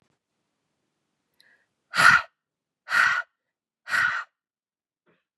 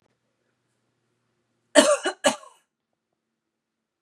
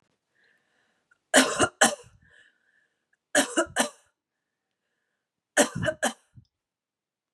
{"exhalation_length": "5.4 s", "exhalation_amplitude": 23595, "exhalation_signal_mean_std_ratio": 0.3, "cough_length": "4.0 s", "cough_amplitude": 30760, "cough_signal_mean_std_ratio": 0.23, "three_cough_length": "7.3 s", "three_cough_amplitude": 21357, "three_cough_signal_mean_std_ratio": 0.29, "survey_phase": "beta (2021-08-13 to 2022-03-07)", "age": "18-44", "gender": "Female", "wearing_mask": "No", "symptom_none": true, "smoker_status": "Ex-smoker", "respiratory_condition_asthma": false, "respiratory_condition_other": false, "recruitment_source": "REACT", "submission_delay": "1 day", "covid_test_result": "Negative", "covid_test_method": "RT-qPCR", "influenza_a_test_result": "Negative", "influenza_b_test_result": "Negative"}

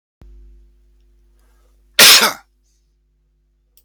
{"cough_length": "3.8 s", "cough_amplitude": 32768, "cough_signal_mean_std_ratio": 0.25, "survey_phase": "beta (2021-08-13 to 2022-03-07)", "age": "45-64", "gender": "Male", "wearing_mask": "No", "symptom_runny_or_blocked_nose": true, "symptom_sore_throat": true, "symptom_headache": true, "symptom_other": true, "smoker_status": "Current smoker (11 or more cigarettes per day)", "respiratory_condition_asthma": false, "respiratory_condition_other": false, "recruitment_source": "Test and Trace", "submission_delay": "2 days", "covid_test_result": "Positive", "covid_test_method": "RT-qPCR", "covid_ct_value": 20.7, "covid_ct_gene": "ORF1ab gene", "covid_ct_mean": 20.9, "covid_viral_load": "140000 copies/ml", "covid_viral_load_category": "Low viral load (10K-1M copies/ml)"}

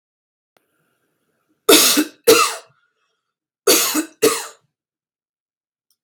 {"cough_length": "6.0 s", "cough_amplitude": 32768, "cough_signal_mean_std_ratio": 0.34, "survey_phase": "beta (2021-08-13 to 2022-03-07)", "age": "18-44", "gender": "Female", "wearing_mask": "No", "symptom_abdominal_pain": true, "symptom_diarrhoea": true, "symptom_fatigue": true, "symptom_fever_high_temperature": true, "symptom_onset": "3 days", "smoker_status": "Never smoked", "respiratory_condition_asthma": false, "respiratory_condition_other": false, "recruitment_source": "Test and Trace", "submission_delay": "1 day", "covid_test_result": "Negative", "covid_test_method": "RT-qPCR"}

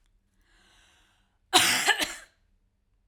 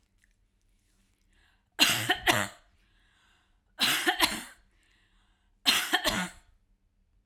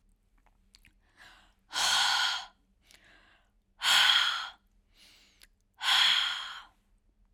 {"cough_length": "3.1 s", "cough_amplitude": 20209, "cough_signal_mean_std_ratio": 0.32, "three_cough_length": "7.3 s", "three_cough_amplitude": 17282, "three_cough_signal_mean_std_ratio": 0.37, "exhalation_length": "7.3 s", "exhalation_amplitude": 11044, "exhalation_signal_mean_std_ratio": 0.43, "survey_phase": "beta (2021-08-13 to 2022-03-07)", "age": "45-64", "gender": "Female", "wearing_mask": "No", "symptom_none": true, "smoker_status": "Never smoked", "respiratory_condition_asthma": false, "respiratory_condition_other": false, "recruitment_source": "Test and Trace", "submission_delay": "1 day", "covid_test_result": "Negative", "covid_test_method": "RT-qPCR"}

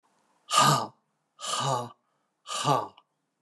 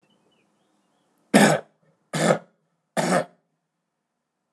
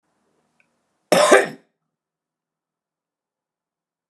{"exhalation_length": "3.4 s", "exhalation_amplitude": 12911, "exhalation_signal_mean_std_ratio": 0.44, "three_cough_length": "4.5 s", "three_cough_amplitude": 26981, "three_cough_signal_mean_std_ratio": 0.31, "cough_length": "4.1 s", "cough_amplitude": 32348, "cough_signal_mean_std_ratio": 0.22, "survey_phase": "alpha (2021-03-01 to 2021-08-12)", "age": "45-64", "gender": "Male", "wearing_mask": "No", "symptom_headache": true, "smoker_status": "Never smoked", "respiratory_condition_asthma": false, "respiratory_condition_other": false, "recruitment_source": "Test and Trace", "submission_delay": "2 days", "covid_test_result": "Positive", "covid_test_method": "RT-qPCR", "covid_ct_value": 19.1, "covid_ct_gene": "N gene"}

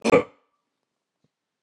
{"cough_length": "1.6 s", "cough_amplitude": 21225, "cough_signal_mean_std_ratio": 0.24, "survey_phase": "beta (2021-08-13 to 2022-03-07)", "age": "45-64", "gender": "Male", "wearing_mask": "No", "symptom_none": true, "symptom_onset": "3 days", "smoker_status": "Ex-smoker", "respiratory_condition_asthma": false, "respiratory_condition_other": false, "recruitment_source": "Test and Trace", "submission_delay": "1 day", "covid_test_result": "Negative", "covid_test_method": "RT-qPCR"}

